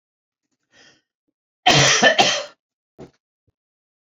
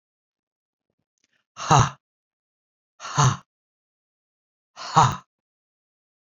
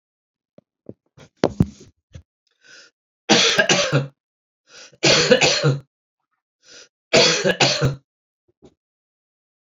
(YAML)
cough_length: 4.2 s
cough_amplitude: 32767
cough_signal_mean_std_ratio: 0.33
exhalation_length: 6.2 s
exhalation_amplitude: 27064
exhalation_signal_mean_std_ratio: 0.25
three_cough_length: 9.6 s
three_cough_amplitude: 32767
three_cough_signal_mean_std_ratio: 0.39
survey_phase: beta (2021-08-13 to 2022-03-07)
age: 65+
gender: Male
wearing_mask: 'No'
symptom_runny_or_blocked_nose: true
symptom_fatigue: true
symptom_change_to_sense_of_smell_or_taste: true
symptom_onset: 3 days
smoker_status: Ex-smoker
respiratory_condition_asthma: false
respiratory_condition_other: false
recruitment_source: Test and Trace
submission_delay: 2 days
covid_test_result: Positive
covid_test_method: RT-qPCR
covid_ct_value: 17.2
covid_ct_gene: ORF1ab gene
covid_ct_mean: 18.3
covid_viral_load: 1000000 copies/ml
covid_viral_load_category: High viral load (>1M copies/ml)